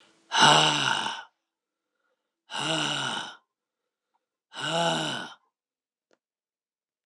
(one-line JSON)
{"exhalation_length": "7.1 s", "exhalation_amplitude": 19122, "exhalation_signal_mean_std_ratio": 0.4, "survey_phase": "beta (2021-08-13 to 2022-03-07)", "age": "65+", "gender": "Male", "wearing_mask": "No", "symptom_none": true, "smoker_status": "Never smoked", "respiratory_condition_asthma": false, "respiratory_condition_other": false, "recruitment_source": "REACT", "submission_delay": "1 day", "covid_test_result": "Negative", "covid_test_method": "RT-qPCR"}